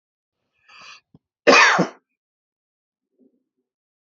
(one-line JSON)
{"cough_length": "4.0 s", "cough_amplitude": 29415, "cough_signal_mean_std_ratio": 0.25, "survey_phase": "alpha (2021-03-01 to 2021-08-12)", "age": "65+", "gender": "Male", "wearing_mask": "No", "symptom_none": true, "smoker_status": "Ex-smoker", "respiratory_condition_asthma": false, "respiratory_condition_other": false, "recruitment_source": "REACT", "submission_delay": "2 days", "covid_test_result": "Negative", "covid_test_method": "RT-qPCR"}